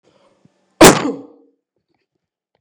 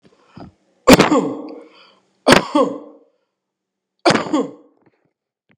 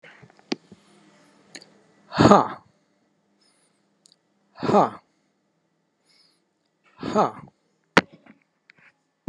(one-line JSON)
{"cough_length": "2.6 s", "cough_amplitude": 29204, "cough_signal_mean_std_ratio": 0.25, "three_cough_length": "5.6 s", "three_cough_amplitude": 29204, "three_cough_signal_mean_std_ratio": 0.34, "exhalation_length": "9.3 s", "exhalation_amplitude": 29204, "exhalation_signal_mean_std_ratio": 0.22, "survey_phase": "beta (2021-08-13 to 2022-03-07)", "age": "45-64", "gender": "Male", "wearing_mask": "No", "symptom_none": true, "smoker_status": "Ex-smoker", "respiratory_condition_asthma": false, "respiratory_condition_other": false, "recruitment_source": "REACT", "submission_delay": "4 days", "covid_test_result": "Negative", "covid_test_method": "RT-qPCR", "influenza_a_test_result": "Negative", "influenza_b_test_result": "Negative"}